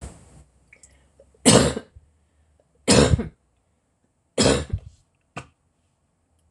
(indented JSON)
{
  "three_cough_length": "6.5 s",
  "three_cough_amplitude": 26027,
  "three_cough_signal_mean_std_ratio": 0.3,
  "survey_phase": "beta (2021-08-13 to 2022-03-07)",
  "age": "65+",
  "gender": "Female",
  "wearing_mask": "No",
  "symptom_cough_any": true,
  "symptom_fatigue": true,
  "symptom_onset": "12 days",
  "smoker_status": "Never smoked",
  "respiratory_condition_asthma": true,
  "respiratory_condition_other": false,
  "recruitment_source": "REACT",
  "submission_delay": "2 days",
  "covid_test_result": "Negative",
  "covid_test_method": "RT-qPCR",
  "influenza_a_test_result": "Negative",
  "influenza_b_test_result": "Negative"
}